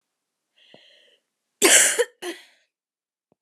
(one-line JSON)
{"cough_length": "3.4 s", "cough_amplitude": 29896, "cough_signal_mean_std_ratio": 0.28, "survey_phase": "beta (2021-08-13 to 2022-03-07)", "age": "18-44", "gender": "Female", "wearing_mask": "No", "symptom_cough_any": true, "symptom_runny_or_blocked_nose": true, "symptom_sore_throat": true, "symptom_fatigue": true, "smoker_status": "Never smoked", "respiratory_condition_asthma": false, "respiratory_condition_other": false, "recruitment_source": "Test and Trace", "submission_delay": "0 days", "covid_test_result": "Positive", "covid_test_method": "RT-qPCR", "covid_ct_value": 25.9, "covid_ct_gene": "ORF1ab gene"}